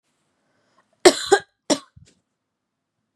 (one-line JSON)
{"cough_length": "3.2 s", "cough_amplitude": 32767, "cough_signal_mean_std_ratio": 0.2, "survey_phase": "beta (2021-08-13 to 2022-03-07)", "age": "18-44", "gender": "Female", "wearing_mask": "No", "symptom_cough_any": true, "symptom_runny_or_blocked_nose": true, "symptom_sore_throat": true, "symptom_abdominal_pain": true, "symptom_diarrhoea": true, "symptom_fatigue": true, "smoker_status": "Never smoked", "respiratory_condition_asthma": false, "respiratory_condition_other": false, "recruitment_source": "REACT", "submission_delay": "2 days", "covid_test_result": "Negative", "covid_test_method": "RT-qPCR", "influenza_a_test_result": "Negative", "influenza_b_test_result": "Negative"}